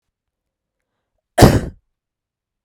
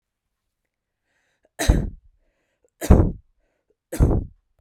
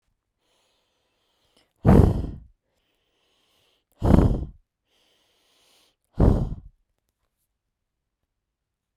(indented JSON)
{
  "cough_length": "2.6 s",
  "cough_amplitude": 32768,
  "cough_signal_mean_std_ratio": 0.22,
  "three_cough_length": "4.6 s",
  "three_cough_amplitude": 32768,
  "three_cough_signal_mean_std_ratio": 0.29,
  "exhalation_length": "9.0 s",
  "exhalation_amplitude": 32768,
  "exhalation_signal_mean_std_ratio": 0.26,
  "survey_phase": "beta (2021-08-13 to 2022-03-07)",
  "age": "18-44",
  "gender": "Female",
  "wearing_mask": "No",
  "symptom_none": true,
  "smoker_status": "Never smoked",
  "respiratory_condition_asthma": false,
  "respiratory_condition_other": false,
  "recruitment_source": "REACT",
  "submission_delay": "1 day",
  "covid_test_result": "Negative",
  "covid_test_method": "RT-qPCR"
}